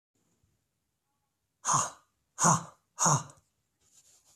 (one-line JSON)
{"exhalation_length": "4.4 s", "exhalation_amplitude": 10332, "exhalation_signal_mean_std_ratio": 0.31, "survey_phase": "beta (2021-08-13 to 2022-03-07)", "age": "45-64", "gender": "Male", "wearing_mask": "No", "symptom_none": true, "smoker_status": "Never smoked", "respiratory_condition_asthma": false, "respiratory_condition_other": false, "recruitment_source": "REACT", "submission_delay": "2 days", "covid_test_result": "Negative", "covid_test_method": "RT-qPCR"}